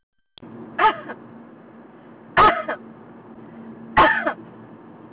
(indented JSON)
{
  "three_cough_length": "5.1 s",
  "three_cough_amplitude": 21834,
  "three_cough_signal_mean_std_ratio": 0.38,
  "survey_phase": "alpha (2021-03-01 to 2021-08-12)",
  "age": "45-64",
  "gender": "Female",
  "wearing_mask": "No",
  "symptom_none": true,
  "smoker_status": "Never smoked",
  "respiratory_condition_asthma": false,
  "respiratory_condition_other": false,
  "recruitment_source": "REACT",
  "submission_delay": "1 day",
  "covid_test_result": "Negative",
  "covid_test_method": "RT-qPCR"
}